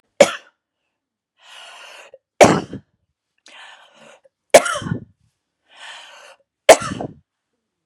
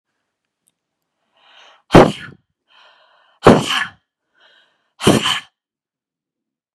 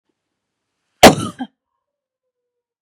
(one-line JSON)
{"three_cough_length": "7.9 s", "three_cough_amplitude": 32768, "three_cough_signal_mean_std_ratio": 0.22, "exhalation_length": "6.7 s", "exhalation_amplitude": 32768, "exhalation_signal_mean_std_ratio": 0.25, "cough_length": "2.8 s", "cough_amplitude": 32768, "cough_signal_mean_std_ratio": 0.19, "survey_phase": "beta (2021-08-13 to 2022-03-07)", "age": "18-44", "gender": "Female", "wearing_mask": "No", "symptom_none": true, "smoker_status": "Never smoked", "respiratory_condition_asthma": false, "respiratory_condition_other": false, "recruitment_source": "REACT", "submission_delay": "7 days", "covid_test_result": "Negative", "covid_test_method": "RT-qPCR", "influenza_a_test_result": "Negative", "influenza_b_test_result": "Negative"}